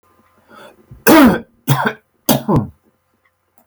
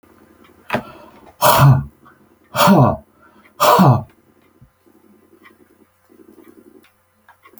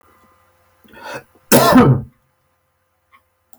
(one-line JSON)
{"three_cough_length": "3.7 s", "three_cough_amplitude": 32768, "three_cough_signal_mean_std_ratio": 0.39, "exhalation_length": "7.6 s", "exhalation_amplitude": 32768, "exhalation_signal_mean_std_ratio": 0.36, "cough_length": "3.6 s", "cough_amplitude": 32768, "cough_signal_mean_std_ratio": 0.33, "survey_phase": "beta (2021-08-13 to 2022-03-07)", "age": "65+", "gender": "Male", "wearing_mask": "No", "symptom_none": true, "smoker_status": "Never smoked", "respiratory_condition_asthma": false, "respiratory_condition_other": false, "recruitment_source": "REACT", "submission_delay": "1 day", "covid_test_result": "Negative", "covid_test_method": "RT-qPCR"}